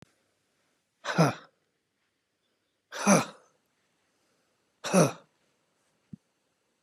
{
  "exhalation_length": "6.8 s",
  "exhalation_amplitude": 12010,
  "exhalation_signal_mean_std_ratio": 0.25,
  "survey_phase": "beta (2021-08-13 to 2022-03-07)",
  "age": "65+",
  "gender": "Male",
  "wearing_mask": "No",
  "symptom_none": true,
  "smoker_status": "Never smoked",
  "respiratory_condition_asthma": true,
  "respiratory_condition_other": false,
  "recruitment_source": "REACT",
  "submission_delay": "4 days",
  "covid_test_result": "Negative",
  "covid_test_method": "RT-qPCR",
  "influenza_a_test_result": "Negative",
  "influenza_b_test_result": "Negative"
}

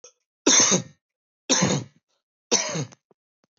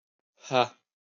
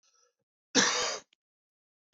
{
  "three_cough_length": "3.6 s",
  "three_cough_amplitude": 16108,
  "three_cough_signal_mean_std_ratio": 0.41,
  "exhalation_length": "1.2 s",
  "exhalation_amplitude": 13003,
  "exhalation_signal_mean_std_ratio": 0.26,
  "cough_length": "2.1 s",
  "cough_amplitude": 12639,
  "cough_signal_mean_std_ratio": 0.33,
  "survey_phase": "beta (2021-08-13 to 2022-03-07)",
  "age": "18-44",
  "gender": "Male",
  "wearing_mask": "No",
  "symptom_cough_any": true,
  "symptom_sore_throat": true,
  "symptom_fatigue": true,
  "symptom_headache": true,
  "smoker_status": "Never smoked",
  "respiratory_condition_asthma": false,
  "respiratory_condition_other": false,
  "recruitment_source": "REACT",
  "submission_delay": "32 days",
  "covid_test_result": "Negative",
  "covid_test_method": "RT-qPCR",
  "covid_ct_value": 41.0,
  "covid_ct_gene": "N gene",
  "influenza_a_test_result": "Unknown/Void",
  "influenza_b_test_result": "Unknown/Void"
}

